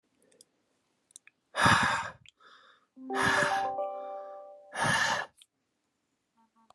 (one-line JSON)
{"exhalation_length": "6.7 s", "exhalation_amplitude": 12058, "exhalation_signal_mean_std_ratio": 0.46, "survey_phase": "beta (2021-08-13 to 2022-03-07)", "age": "18-44", "gender": "Male", "wearing_mask": "No", "symptom_cough_any": true, "symptom_fatigue": true, "symptom_onset": "10 days", "smoker_status": "Never smoked", "respiratory_condition_asthma": false, "respiratory_condition_other": false, "recruitment_source": "REACT", "submission_delay": "2 days", "covid_test_result": "Negative", "covid_test_method": "RT-qPCR", "influenza_a_test_result": "Negative", "influenza_b_test_result": "Negative"}